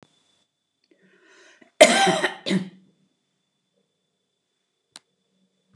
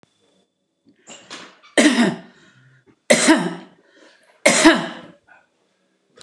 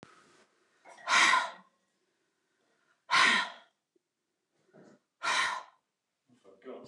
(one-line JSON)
{"cough_length": "5.8 s", "cough_amplitude": 29204, "cough_signal_mean_std_ratio": 0.23, "three_cough_length": "6.2 s", "three_cough_amplitude": 29204, "three_cough_signal_mean_std_ratio": 0.35, "exhalation_length": "6.9 s", "exhalation_amplitude": 9526, "exhalation_signal_mean_std_ratio": 0.34, "survey_phase": "beta (2021-08-13 to 2022-03-07)", "age": "65+", "gender": "Female", "wearing_mask": "No", "symptom_none": true, "smoker_status": "Ex-smoker", "respiratory_condition_asthma": false, "respiratory_condition_other": false, "recruitment_source": "REACT", "submission_delay": "2 days", "covid_test_result": "Negative", "covid_test_method": "RT-qPCR", "influenza_a_test_result": "Negative", "influenza_b_test_result": "Negative"}